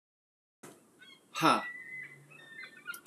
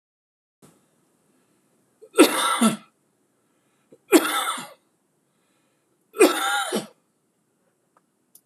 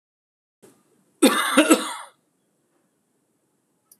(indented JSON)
{
  "exhalation_length": "3.1 s",
  "exhalation_amplitude": 9367,
  "exhalation_signal_mean_std_ratio": 0.34,
  "three_cough_length": "8.5 s",
  "three_cough_amplitude": 26027,
  "three_cough_signal_mean_std_ratio": 0.3,
  "cough_length": "4.0 s",
  "cough_amplitude": 26027,
  "cough_signal_mean_std_ratio": 0.29,
  "survey_phase": "alpha (2021-03-01 to 2021-08-12)",
  "age": "45-64",
  "gender": "Male",
  "wearing_mask": "No",
  "symptom_none": true,
  "smoker_status": "Never smoked",
  "respiratory_condition_asthma": false,
  "respiratory_condition_other": false,
  "recruitment_source": "REACT",
  "submission_delay": "3 days",
  "covid_test_result": "Negative",
  "covid_test_method": "RT-qPCR"
}